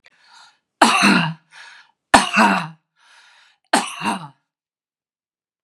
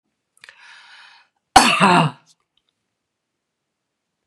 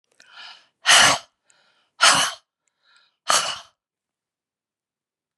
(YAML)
three_cough_length: 5.6 s
three_cough_amplitude: 32768
three_cough_signal_mean_std_ratio: 0.37
cough_length: 4.3 s
cough_amplitude: 32768
cough_signal_mean_std_ratio: 0.27
exhalation_length: 5.4 s
exhalation_amplitude: 32430
exhalation_signal_mean_std_ratio: 0.31
survey_phase: beta (2021-08-13 to 2022-03-07)
age: 45-64
gender: Female
wearing_mask: 'No'
symptom_cough_any: true
symptom_onset: 12 days
smoker_status: Never smoked
respiratory_condition_asthma: false
respiratory_condition_other: false
recruitment_source: REACT
submission_delay: 2 days
covid_test_result: Negative
covid_test_method: RT-qPCR
influenza_a_test_result: Negative
influenza_b_test_result: Negative